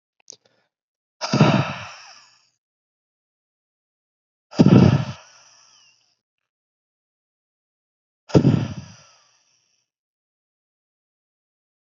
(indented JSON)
{
  "exhalation_length": "11.9 s",
  "exhalation_amplitude": 30778,
  "exhalation_signal_mean_std_ratio": 0.24,
  "survey_phase": "beta (2021-08-13 to 2022-03-07)",
  "age": "45-64",
  "gender": "Male",
  "wearing_mask": "No",
  "symptom_cough_any": true,
  "symptom_runny_or_blocked_nose": true,
  "symptom_fatigue": true,
  "symptom_fever_high_temperature": true,
  "symptom_onset": "4 days",
  "smoker_status": "Never smoked",
  "respiratory_condition_asthma": false,
  "respiratory_condition_other": false,
  "recruitment_source": "Test and Trace",
  "submission_delay": "2 days",
  "covid_test_result": "Positive",
  "covid_test_method": "RT-qPCR"
}